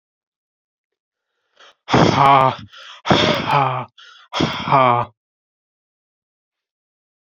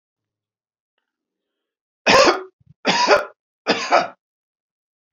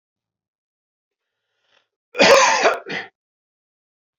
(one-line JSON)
{"exhalation_length": "7.3 s", "exhalation_amplitude": 31164, "exhalation_signal_mean_std_ratio": 0.4, "three_cough_length": "5.1 s", "three_cough_amplitude": 32767, "three_cough_signal_mean_std_ratio": 0.35, "cough_length": "4.2 s", "cough_amplitude": 29992, "cough_signal_mean_std_ratio": 0.31, "survey_phase": "beta (2021-08-13 to 2022-03-07)", "age": "45-64", "gender": "Male", "wearing_mask": "No", "symptom_none": true, "smoker_status": "Never smoked", "respiratory_condition_asthma": false, "respiratory_condition_other": false, "recruitment_source": "REACT", "submission_delay": "1 day", "covid_test_result": "Negative", "covid_test_method": "RT-qPCR"}